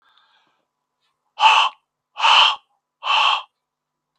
exhalation_length: 4.2 s
exhalation_amplitude: 31201
exhalation_signal_mean_std_ratio: 0.39
survey_phase: beta (2021-08-13 to 2022-03-07)
age: 65+
gender: Male
wearing_mask: 'No'
symptom_none: true
smoker_status: Never smoked
respiratory_condition_asthma: false
respiratory_condition_other: false
recruitment_source: REACT
submission_delay: 0 days
covid_test_result: Negative
covid_test_method: RT-qPCR
influenza_a_test_result: Negative
influenza_b_test_result: Negative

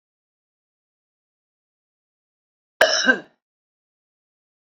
cough_length: 4.6 s
cough_amplitude: 27185
cough_signal_mean_std_ratio: 0.2
survey_phase: beta (2021-08-13 to 2022-03-07)
age: 45-64
gender: Female
wearing_mask: 'No'
symptom_none: true
smoker_status: Current smoker (1 to 10 cigarettes per day)
respiratory_condition_asthma: false
respiratory_condition_other: false
recruitment_source: REACT
submission_delay: 2 days
covid_test_result: Negative
covid_test_method: RT-qPCR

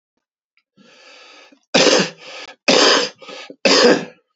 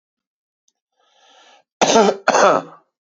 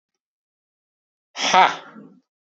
three_cough_length: 4.4 s
three_cough_amplitude: 31386
three_cough_signal_mean_std_ratio: 0.44
cough_length: 3.1 s
cough_amplitude: 31980
cough_signal_mean_std_ratio: 0.37
exhalation_length: 2.5 s
exhalation_amplitude: 28600
exhalation_signal_mean_std_ratio: 0.27
survey_phase: beta (2021-08-13 to 2022-03-07)
age: 45-64
gender: Male
wearing_mask: 'No'
symptom_fever_high_temperature: true
symptom_headache: true
symptom_onset: 3 days
smoker_status: Ex-smoker
respiratory_condition_asthma: false
respiratory_condition_other: false
recruitment_source: Test and Trace
submission_delay: 1 day
covid_test_result: Positive
covid_test_method: RT-qPCR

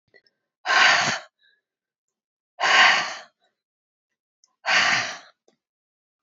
exhalation_length: 6.2 s
exhalation_amplitude: 26128
exhalation_signal_mean_std_ratio: 0.39
survey_phase: beta (2021-08-13 to 2022-03-07)
age: 65+
gender: Female
wearing_mask: 'No'
symptom_runny_or_blocked_nose: true
symptom_onset: 5 days
smoker_status: Never smoked
respiratory_condition_asthma: false
respiratory_condition_other: false
recruitment_source: REACT
submission_delay: 3 days
covid_test_result: Negative
covid_test_method: RT-qPCR
influenza_a_test_result: Negative
influenza_b_test_result: Negative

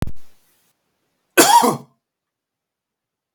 cough_length: 3.3 s
cough_amplitude: 32768
cough_signal_mean_std_ratio: 0.33
survey_phase: beta (2021-08-13 to 2022-03-07)
age: 18-44
gender: Male
wearing_mask: 'No'
symptom_none: true
smoker_status: Never smoked
respiratory_condition_asthma: false
respiratory_condition_other: false
recruitment_source: REACT
submission_delay: 0 days
covid_test_result: Negative
covid_test_method: RT-qPCR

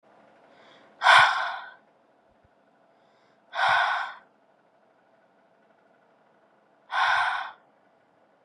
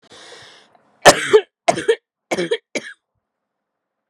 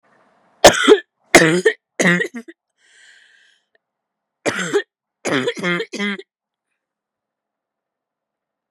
exhalation_length: 8.4 s
exhalation_amplitude: 23585
exhalation_signal_mean_std_ratio: 0.33
cough_length: 4.1 s
cough_amplitude: 32768
cough_signal_mean_std_ratio: 0.29
three_cough_length: 8.7 s
three_cough_amplitude: 32768
three_cough_signal_mean_std_ratio: 0.32
survey_phase: beta (2021-08-13 to 2022-03-07)
age: 18-44
gender: Female
wearing_mask: 'No'
symptom_cough_any: true
symptom_new_continuous_cough: true
symptom_runny_or_blocked_nose: true
symptom_shortness_of_breath: true
symptom_headache: true
symptom_change_to_sense_of_smell_or_taste: true
symptom_loss_of_taste: true
smoker_status: Never smoked
respiratory_condition_asthma: false
respiratory_condition_other: false
recruitment_source: Test and Trace
submission_delay: 4 days
covid_test_result: Positive
covid_test_method: RT-qPCR
covid_ct_value: 19.5
covid_ct_gene: ORF1ab gene
covid_ct_mean: 20.4
covid_viral_load: 200000 copies/ml
covid_viral_load_category: Low viral load (10K-1M copies/ml)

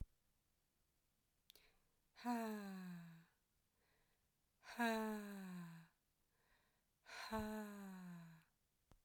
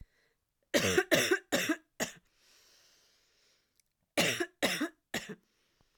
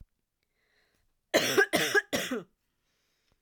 exhalation_length: 9.0 s
exhalation_amplitude: 1056
exhalation_signal_mean_std_ratio: 0.48
three_cough_length: 6.0 s
three_cough_amplitude: 10302
three_cough_signal_mean_std_ratio: 0.39
cough_length: 3.4 s
cough_amplitude: 11597
cough_signal_mean_std_ratio: 0.37
survey_phase: alpha (2021-03-01 to 2021-08-12)
age: 18-44
gender: Female
wearing_mask: 'No'
symptom_none: true
smoker_status: Never smoked
respiratory_condition_asthma: false
respiratory_condition_other: false
recruitment_source: REACT
submission_delay: 14 days
covid_test_result: Negative
covid_test_method: RT-qPCR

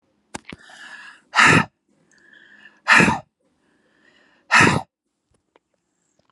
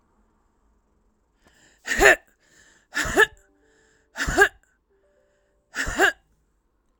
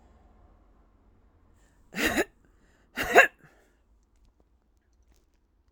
exhalation_length: 6.3 s
exhalation_amplitude: 30235
exhalation_signal_mean_std_ratio: 0.31
three_cough_length: 7.0 s
three_cough_amplitude: 30706
three_cough_signal_mean_std_ratio: 0.29
cough_length: 5.7 s
cough_amplitude: 22972
cough_signal_mean_std_ratio: 0.21
survey_phase: alpha (2021-03-01 to 2021-08-12)
age: 45-64
gender: Female
wearing_mask: 'No'
symptom_fever_high_temperature: true
symptom_change_to_sense_of_smell_or_taste: true
symptom_loss_of_taste: true
smoker_status: Current smoker (11 or more cigarettes per day)
respiratory_condition_asthma: false
respiratory_condition_other: false
recruitment_source: Test and Trace
submission_delay: 1 day
covid_test_result: Positive
covid_test_method: RT-qPCR
covid_ct_value: 17.4
covid_ct_gene: ORF1ab gene
covid_ct_mean: 18.0
covid_viral_load: 1300000 copies/ml
covid_viral_load_category: High viral load (>1M copies/ml)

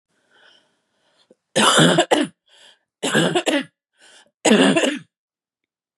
three_cough_length: 6.0 s
three_cough_amplitude: 30603
three_cough_signal_mean_std_ratio: 0.43
survey_phase: beta (2021-08-13 to 2022-03-07)
age: 18-44
gender: Female
wearing_mask: 'No'
symptom_cough_any: true
symptom_new_continuous_cough: true
symptom_runny_or_blocked_nose: true
symptom_sore_throat: true
symptom_fatigue: true
symptom_onset: 3 days
smoker_status: Never smoked
respiratory_condition_asthma: false
respiratory_condition_other: false
recruitment_source: Test and Trace
submission_delay: 1 day
covid_test_result: Positive
covid_test_method: RT-qPCR
covid_ct_value: 30.8
covid_ct_gene: N gene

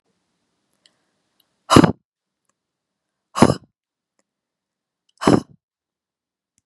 exhalation_length: 6.7 s
exhalation_amplitude: 32768
exhalation_signal_mean_std_ratio: 0.18
survey_phase: beta (2021-08-13 to 2022-03-07)
age: 18-44
gender: Female
wearing_mask: 'No'
symptom_headache: true
smoker_status: Never smoked
respiratory_condition_asthma: false
respiratory_condition_other: false
recruitment_source: Test and Trace
submission_delay: 1 day
covid_test_result: Positive
covid_test_method: ePCR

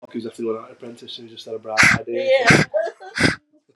exhalation_length: 3.8 s
exhalation_amplitude: 32522
exhalation_signal_mean_std_ratio: 0.54
survey_phase: beta (2021-08-13 to 2022-03-07)
age: 18-44
gender: Female
wearing_mask: 'No'
symptom_none: true
smoker_status: Never smoked
respiratory_condition_asthma: false
respiratory_condition_other: false
recruitment_source: REACT
submission_delay: 3 days
covid_test_result: Negative
covid_test_method: RT-qPCR
influenza_a_test_result: Negative
influenza_b_test_result: Negative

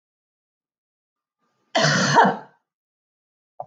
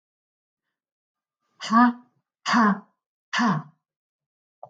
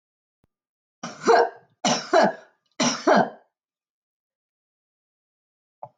cough_length: 3.7 s
cough_amplitude: 23869
cough_signal_mean_std_ratio: 0.33
exhalation_length: 4.7 s
exhalation_amplitude: 16500
exhalation_signal_mean_std_ratio: 0.34
three_cough_length: 6.0 s
three_cough_amplitude: 16475
three_cough_signal_mean_std_ratio: 0.33
survey_phase: beta (2021-08-13 to 2022-03-07)
age: 45-64
gender: Female
wearing_mask: 'No'
symptom_none: true
smoker_status: Never smoked
respiratory_condition_asthma: false
respiratory_condition_other: false
recruitment_source: REACT
submission_delay: 1 day
covid_test_result: Negative
covid_test_method: RT-qPCR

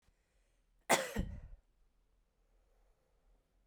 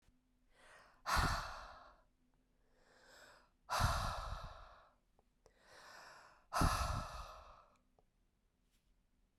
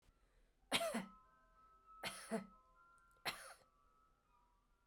cough_length: 3.7 s
cough_amplitude: 5626
cough_signal_mean_std_ratio: 0.25
exhalation_length: 9.4 s
exhalation_amplitude: 2947
exhalation_signal_mean_std_ratio: 0.39
three_cough_length: 4.9 s
three_cough_amplitude: 2496
three_cough_signal_mean_std_ratio: 0.37
survey_phase: beta (2021-08-13 to 2022-03-07)
age: 45-64
gender: Female
wearing_mask: 'No'
symptom_none: true
smoker_status: Ex-smoker
respiratory_condition_asthma: true
respiratory_condition_other: false
recruitment_source: Test and Trace
submission_delay: 0 days
covid_test_result: Negative
covid_test_method: LFT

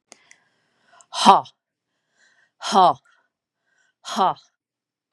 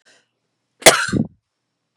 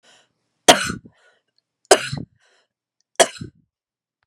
exhalation_length: 5.1 s
exhalation_amplitude: 32768
exhalation_signal_mean_std_ratio: 0.26
cough_length: 2.0 s
cough_amplitude: 32768
cough_signal_mean_std_ratio: 0.27
three_cough_length: 4.3 s
three_cough_amplitude: 32768
three_cough_signal_mean_std_ratio: 0.21
survey_phase: beta (2021-08-13 to 2022-03-07)
age: 45-64
gender: Female
wearing_mask: 'No'
symptom_none: true
smoker_status: Never smoked
respiratory_condition_asthma: false
respiratory_condition_other: false
recruitment_source: REACT
submission_delay: 1 day
covid_test_result: Negative
covid_test_method: RT-qPCR
influenza_a_test_result: Negative
influenza_b_test_result: Negative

